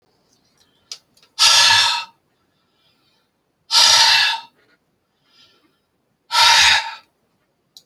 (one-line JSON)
{"exhalation_length": "7.9 s", "exhalation_amplitude": 32768, "exhalation_signal_mean_std_ratio": 0.4, "survey_phase": "beta (2021-08-13 to 2022-03-07)", "age": "65+", "gender": "Male", "wearing_mask": "No", "symptom_none": true, "smoker_status": "Never smoked", "respiratory_condition_asthma": false, "respiratory_condition_other": false, "recruitment_source": "REACT", "submission_delay": "3 days", "covid_test_result": "Negative", "covid_test_method": "RT-qPCR"}